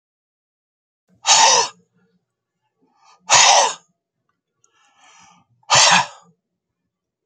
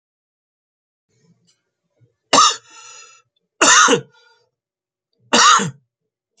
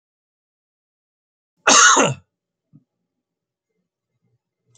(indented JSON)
{
  "exhalation_length": "7.3 s",
  "exhalation_amplitude": 32768,
  "exhalation_signal_mean_std_ratio": 0.33,
  "three_cough_length": "6.4 s",
  "three_cough_amplitude": 32645,
  "three_cough_signal_mean_std_ratio": 0.32,
  "cough_length": "4.8 s",
  "cough_amplitude": 31490,
  "cough_signal_mean_std_ratio": 0.24,
  "survey_phase": "beta (2021-08-13 to 2022-03-07)",
  "age": "45-64",
  "gender": "Male",
  "wearing_mask": "No",
  "symptom_fatigue": true,
  "symptom_headache": true,
  "symptom_change_to_sense_of_smell_or_taste": true,
  "symptom_loss_of_taste": true,
  "smoker_status": "Ex-smoker",
  "respiratory_condition_asthma": false,
  "respiratory_condition_other": false,
  "recruitment_source": "Test and Trace",
  "submission_delay": "2 days",
  "covid_test_result": "Positive",
  "covid_test_method": "LFT"
}